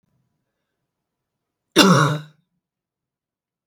{"cough_length": "3.7 s", "cough_amplitude": 32768, "cough_signal_mean_std_ratio": 0.26, "survey_phase": "beta (2021-08-13 to 2022-03-07)", "age": "45-64", "gender": "Female", "wearing_mask": "No", "symptom_none": true, "smoker_status": "Never smoked", "respiratory_condition_asthma": false, "respiratory_condition_other": false, "recruitment_source": "REACT", "submission_delay": "1 day", "covid_test_result": "Negative", "covid_test_method": "RT-qPCR", "influenza_a_test_result": "Negative", "influenza_b_test_result": "Negative"}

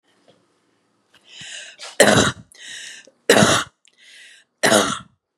{"three_cough_length": "5.4 s", "three_cough_amplitude": 32768, "three_cough_signal_mean_std_ratio": 0.36, "survey_phase": "beta (2021-08-13 to 2022-03-07)", "age": "45-64", "gender": "Female", "wearing_mask": "No", "symptom_cough_any": true, "symptom_runny_or_blocked_nose": true, "symptom_sore_throat": true, "symptom_fatigue": true, "smoker_status": "Never smoked", "respiratory_condition_asthma": false, "respiratory_condition_other": false, "recruitment_source": "Test and Trace", "submission_delay": "2 days", "covid_test_result": "Positive", "covid_test_method": "RT-qPCR", "covid_ct_value": 28.5, "covid_ct_gene": "ORF1ab gene", "covid_ct_mean": 29.5, "covid_viral_load": "210 copies/ml", "covid_viral_load_category": "Minimal viral load (< 10K copies/ml)"}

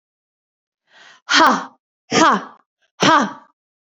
{"exhalation_length": "3.9 s", "exhalation_amplitude": 30536, "exhalation_signal_mean_std_ratio": 0.38, "survey_phase": "beta (2021-08-13 to 2022-03-07)", "age": "18-44", "gender": "Female", "wearing_mask": "No", "symptom_cough_any": true, "symptom_runny_or_blocked_nose": true, "smoker_status": "Never smoked", "respiratory_condition_asthma": false, "respiratory_condition_other": false, "recruitment_source": "Test and Trace", "submission_delay": "1 day", "covid_test_result": "Positive", "covid_test_method": "ePCR"}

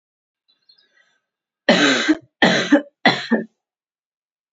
{"three_cough_length": "4.5 s", "three_cough_amplitude": 29507, "three_cough_signal_mean_std_ratio": 0.38, "survey_phase": "beta (2021-08-13 to 2022-03-07)", "age": "18-44", "gender": "Female", "wearing_mask": "No", "symptom_cough_any": true, "symptom_new_continuous_cough": true, "symptom_runny_or_blocked_nose": true, "symptom_sore_throat": true, "symptom_fever_high_temperature": true, "symptom_onset": "2 days", "smoker_status": "Never smoked", "respiratory_condition_asthma": false, "respiratory_condition_other": false, "recruitment_source": "Test and Trace", "submission_delay": "1 day", "covid_test_result": "Positive", "covid_test_method": "RT-qPCR", "covid_ct_value": 18.9, "covid_ct_gene": "ORF1ab gene", "covid_ct_mean": 19.1, "covid_viral_load": "550000 copies/ml", "covid_viral_load_category": "Low viral load (10K-1M copies/ml)"}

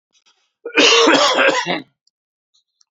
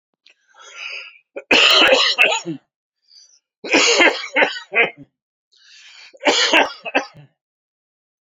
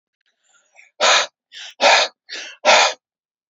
{"cough_length": "2.9 s", "cough_amplitude": 30378, "cough_signal_mean_std_ratio": 0.5, "three_cough_length": "8.3 s", "three_cough_amplitude": 31548, "three_cough_signal_mean_std_ratio": 0.45, "exhalation_length": "3.5 s", "exhalation_amplitude": 30748, "exhalation_signal_mean_std_ratio": 0.41, "survey_phase": "alpha (2021-03-01 to 2021-08-12)", "age": "45-64", "gender": "Male", "wearing_mask": "No", "symptom_fatigue": true, "symptom_onset": "11 days", "smoker_status": "Never smoked", "respiratory_condition_asthma": false, "respiratory_condition_other": false, "recruitment_source": "REACT", "submission_delay": "1 day", "covid_test_result": "Negative", "covid_test_method": "RT-qPCR"}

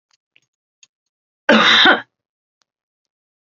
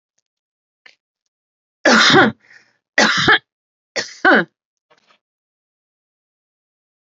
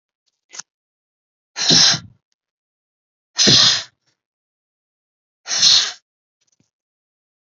{"cough_length": "3.6 s", "cough_amplitude": 32768, "cough_signal_mean_std_ratio": 0.31, "three_cough_length": "7.1 s", "three_cough_amplitude": 30707, "three_cough_signal_mean_std_ratio": 0.32, "exhalation_length": "7.5 s", "exhalation_amplitude": 32767, "exhalation_signal_mean_std_ratio": 0.32, "survey_phase": "beta (2021-08-13 to 2022-03-07)", "age": "45-64", "gender": "Female", "wearing_mask": "No", "symptom_none": true, "smoker_status": "Never smoked", "respiratory_condition_asthma": false, "respiratory_condition_other": false, "recruitment_source": "REACT", "submission_delay": "1 day", "covid_test_result": "Negative", "covid_test_method": "RT-qPCR"}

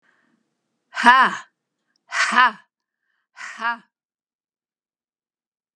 {"exhalation_length": "5.8 s", "exhalation_amplitude": 32768, "exhalation_signal_mean_std_ratio": 0.28, "survey_phase": "beta (2021-08-13 to 2022-03-07)", "age": "65+", "gender": "Female", "wearing_mask": "No", "symptom_runny_or_blocked_nose": true, "symptom_onset": "7 days", "smoker_status": "Ex-smoker", "respiratory_condition_asthma": false, "respiratory_condition_other": false, "recruitment_source": "REACT", "submission_delay": "3 days", "covid_test_result": "Negative", "covid_test_method": "RT-qPCR", "influenza_a_test_result": "Negative", "influenza_b_test_result": "Negative"}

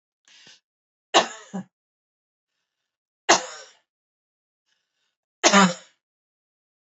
{"three_cough_length": "7.0 s", "three_cough_amplitude": 29007, "three_cough_signal_mean_std_ratio": 0.22, "survey_phase": "beta (2021-08-13 to 2022-03-07)", "age": "45-64", "gender": "Female", "wearing_mask": "No", "symptom_none": true, "smoker_status": "Never smoked", "respiratory_condition_asthma": false, "respiratory_condition_other": false, "recruitment_source": "REACT", "submission_delay": "3 days", "covid_test_result": "Negative", "covid_test_method": "RT-qPCR", "influenza_a_test_result": "Negative", "influenza_b_test_result": "Negative"}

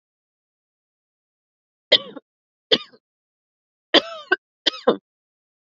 {"three_cough_length": "5.7 s", "three_cough_amplitude": 31265, "three_cough_signal_mean_std_ratio": 0.2, "survey_phase": "beta (2021-08-13 to 2022-03-07)", "age": "18-44", "gender": "Female", "wearing_mask": "No", "symptom_cough_any": true, "symptom_sore_throat": true, "symptom_abdominal_pain": true, "symptom_fever_high_temperature": true, "symptom_headache": true, "smoker_status": "Never smoked", "respiratory_condition_asthma": false, "respiratory_condition_other": false, "recruitment_source": "Test and Trace", "submission_delay": "1 day", "covid_test_result": "Positive", "covid_test_method": "LFT"}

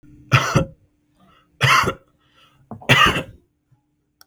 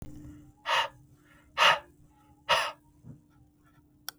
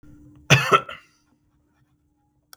{"three_cough_length": "4.3 s", "three_cough_amplitude": 32768, "three_cough_signal_mean_std_ratio": 0.38, "exhalation_length": "4.2 s", "exhalation_amplitude": 12121, "exhalation_signal_mean_std_ratio": 0.34, "cough_length": "2.6 s", "cough_amplitude": 32766, "cough_signal_mean_std_ratio": 0.26, "survey_phase": "beta (2021-08-13 to 2022-03-07)", "age": "45-64", "gender": "Male", "wearing_mask": "No", "symptom_none": true, "smoker_status": "Never smoked", "respiratory_condition_asthma": true, "respiratory_condition_other": false, "recruitment_source": "REACT", "submission_delay": "2 days", "covid_test_result": "Negative", "covid_test_method": "RT-qPCR", "influenza_a_test_result": "Unknown/Void", "influenza_b_test_result": "Unknown/Void"}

